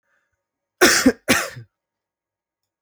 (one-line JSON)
{"cough_length": "2.8 s", "cough_amplitude": 31560, "cough_signal_mean_std_ratio": 0.31, "survey_phase": "alpha (2021-03-01 to 2021-08-12)", "age": "18-44", "gender": "Male", "wearing_mask": "No", "symptom_none": true, "smoker_status": "Never smoked", "respiratory_condition_asthma": true, "respiratory_condition_other": false, "recruitment_source": "REACT", "submission_delay": "1 day", "covid_test_result": "Negative", "covid_test_method": "RT-qPCR"}